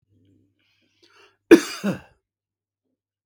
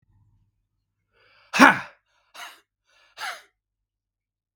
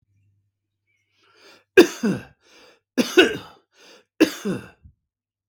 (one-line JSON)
{"cough_length": "3.3 s", "cough_amplitude": 32768, "cough_signal_mean_std_ratio": 0.17, "exhalation_length": "4.6 s", "exhalation_amplitude": 32767, "exhalation_signal_mean_std_ratio": 0.18, "three_cough_length": "5.5 s", "three_cough_amplitude": 32768, "three_cough_signal_mean_std_ratio": 0.26, "survey_phase": "beta (2021-08-13 to 2022-03-07)", "age": "45-64", "gender": "Male", "wearing_mask": "No", "symptom_none": true, "smoker_status": "Ex-smoker", "respiratory_condition_asthma": false, "respiratory_condition_other": false, "recruitment_source": "REACT", "submission_delay": "0 days", "covid_test_result": "Negative", "covid_test_method": "RT-qPCR", "influenza_a_test_result": "Negative", "influenza_b_test_result": "Negative"}